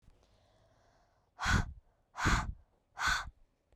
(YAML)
exhalation_length: 3.8 s
exhalation_amplitude: 4638
exhalation_signal_mean_std_ratio: 0.4
survey_phase: beta (2021-08-13 to 2022-03-07)
age: 18-44
gender: Female
wearing_mask: 'No'
symptom_cough_any: true
symptom_runny_or_blocked_nose: true
symptom_shortness_of_breath: true
symptom_sore_throat: true
symptom_abdominal_pain: true
symptom_diarrhoea: true
symptom_fatigue: true
symptom_headache: true
smoker_status: Never smoked
respiratory_condition_asthma: false
respiratory_condition_other: false
recruitment_source: Test and Trace
submission_delay: 2 days
covid_test_result: Positive
covid_test_method: LFT